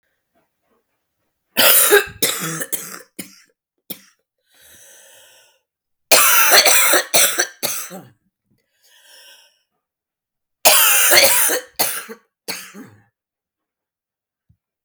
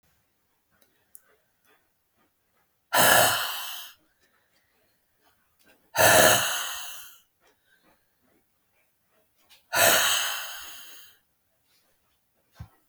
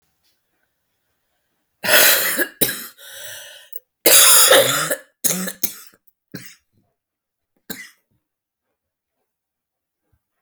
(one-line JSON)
{"three_cough_length": "14.8 s", "three_cough_amplitude": 32768, "three_cough_signal_mean_std_ratio": 0.39, "exhalation_length": "12.9 s", "exhalation_amplitude": 24777, "exhalation_signal_mean_std_ratio": 0.33, "cough_length": "10.4 s", "cough_amplitude": 32768, "cough_signal_mean_std_ratio": 0.34, "survey_phase": "beta (2021-08-13 to 2022-03-07)", "age": "45-64", "gender": "Female", "wearing_mask": "No", "symptom_cough_any": true, "symptom_runny_or_blocked_nose": true, "symptom_sore_throat": true, "symptom_fatigue": true, "symptom_headache": true, "symptom_onset": "3 days", "smoker_status": "Ex-smoker", "respiratory_condition_asthma": false, "respiratory_condition_other": false, "recruitment_source": "Test and Trace", "submission_delay": "1 day", "covid_test_result": "Positive", "covid_test_method": "RT-qPCR", "covid_ct_value": 21.2, "covid_ct_gene": "N gene", "covid_ct_mean": 21.3, "covid_viral_load": "100000 copies/ml", "covid_viral_load_category": "Low viral load (10K-1M copies/ml)"}